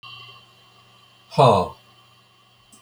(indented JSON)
{
  "exhalation_length": "2.8 s",
  "exhalation_amplitude": 25755,
  "exhalation_signal_mean_std_ratio": 0.29,
  "survey_phase": "beta (2021-08-13 to 2022-03-07)",
  "age": "65+",
  "gender": "Male",
  "wearing_mask": "No",
  "symptom_none": true,
  "smoker_status": "Never smoked",
  "respiratory_condition_asthma": false,
  "respiratory_condition_other": false,
  "recruitment_source": "REACT",
  "submission_delay": "2 days",
  "covid_test_result": "Negative",
  "covid_test_method": "RT-qPCR"
}